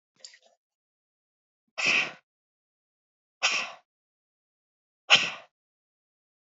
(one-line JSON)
{"exhalation_length": "6.6 s", "exhalation_amplitude": 21187, "exhalation_signal_mean_std_ratio": 0.24, "survey_phase": "alpha (2021-03-01 to 2021-08-12)", "age": "45-64", "gender": "Female", "wearing_mask": "No", "symptom_none": true, "smoker_status": "Never smoked", "respiratory_condition_asthma": false, "respiratory_condition_other": false, "recruitment_source": "REACT", "submission_delay": "4 days", "covid_test_result": "Negative", "covid_test_method": "RT-qPCR"}